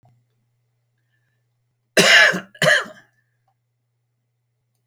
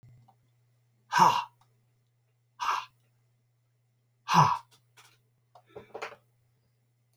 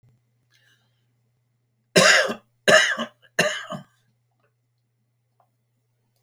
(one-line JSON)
{"cough_length": "4.9 s", "cough_amplitude": 32767, "cough_signal_mean_std_ratio": 0.29, "exhalation_length": "7.2 s", "exhalation_amplitude": 13003, "exhalation_signal_mean_std_ratio": 0.26, "three_cough_length": "6.2 s", "three_cough_amplitude": 28858, "three_cough_signal_mean_std_ratio": 0.29, "survey_phase": "beta (2021-08-13 to 2022-03-07)", "age": "65+", "gender": "Male", "wearing_mask": "No", "symptom_none": true, "smoker_status": "Ex-smoker", "respiratory_condition_asthma": false, "respiratory_condition_other": false, "recruitment_source": "REACT", "submission_delay": "4 days", "covid_test_result": "Negative", "covid_test_method": "RT-qPCR"}